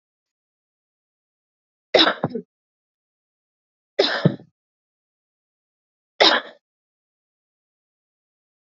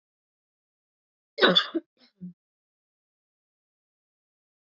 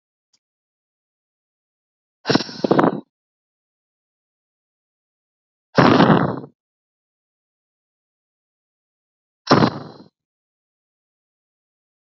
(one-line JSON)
{"three_cough_length": "8.7 s", "three_cough_amplitude": 28630, "three_cough_signal_mean_std_ratio": 0.22, "cough_length": "4.7 s", "cough_amplitude": 18983, "cough_signal_mean_std_ratio": 0.19, "exhalation_length": "12.1 s", "exhalation_amplitude": 32768, "exhalation_signal_mean_std_ratio": 0.24, "survey_phase": "alpha (2021-03-01 to 2021-08-12)", "age": "18-44", "gender": "Female", "wearing_mask": "No", "symptom_fatigue": true, "symptom_headache": true, "smoker_status": "Current smoker (1 to 10 cigarettes per day)", "respiratory_condition_asthma": false, "respiratory_condition_other": false, "recruitment_source": "Test and Trace", "submission_delay": "1 day", "covid_test_result": "Positive", "covid_test_method": "RT-qPCR"}